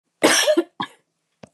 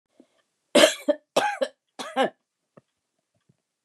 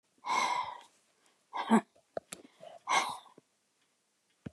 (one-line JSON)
{"cough_length": "1.5 s", "cough_amplitude": 27316, "cough_signal_mean_std_ratio": 0.44, "three_cough_length": "3.8 s", "three_cough_amplitude": 27809, "three_cough_signal_mean_std_ratio": 0.3, "exhalation_length": "4.5 s", "exhalation_amplitude": 6542, "exhalation_signal_mean_std_ratio": 0.36, "survey_phase": "beta (2021-08-13 to 2022-03-07)", "age": "65+", "gender": "Female", "wearing_mask": "No", "symptom_none": true, "symptom_onset": "12 days", "smoker_status": "Ex-smoker", "respiratory_condition_asthma": false, "respiratory_condition_other": false, "recruitment_source": "REACT", "submission_delay": "2 days", "covid_test_result": "Negative", "covid_test_method": "RT-qPCR", "influenza_a_test_result": "Negative", "influenza_b_test_result": "Negative"}